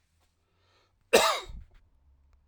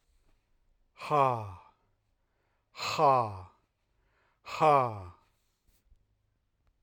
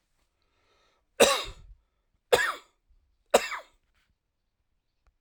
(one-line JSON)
{"cough_length": "2.5 s", "cough_amplitude": 17612, "cough_signal_mean_std_ratio": 0.26, "exhalation_length": "6.8 s", "exhalation_amplitude": 8633, "exhalation_signal_mean_std_ratio": 0.33, "three_cough_length": "5.2 s", "three_cough_amplitude": 26123, "three_cough_signal_mean_std_ratio": 0.24, "survey_phase": "alpha (2021-03-01 to 2021-08-12)", "age": "45-64", "gender": "Male", "wearing_mask": "No", "symptom_cough_any": true, "symptom_shortness_of_breath": true, "symptom_fatigue": true, "symptom_headache": true, "smoker_status": "Ex-smoker", "respiratory_condition_asthma": false, "respiratory_condition_other": false, "recruitment_source": "Test and Trace", "submission_delay": "2 days", "covid_test_result": "Positive", "covid_test_method": "RT-qPCR", "covid_ct_value": 24.7, "covid_ct_gene": "ORF1ab gene"}